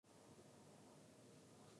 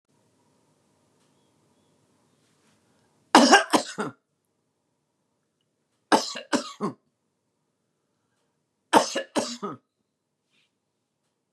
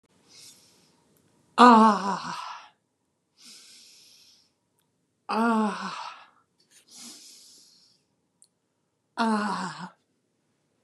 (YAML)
cough_length: 1.8 s
cough_amplitude: 81
cough_signal_mean_std_ratio: 1.23
three_cough_length: 11.5 s
three_cough_amplitude: 31805
three_cough_signal_mean_std_ratio: 0.23
exhalation_length: 10.8 s
exhalation_amplitude: 29696
exhalation_signal_mean_std_ratio: 0.28
survey_phase: beta (2021-08-13 to 2022-03-07)
age: 65+
gender: Female
wearing_mask: 'No'
symptom_cough_any: true
symptom_onset: 12 days
smoker_status: Never smoked
respiratory_condition_asthma: false
respiratory_condition_other: false
recruitment_source: REACT
submission_delay: 2 days
covid_test_result: Negative
covid_test_method: RT-qPCR
influenza_a_test_result: Negative
influenza_b_test_result: Negative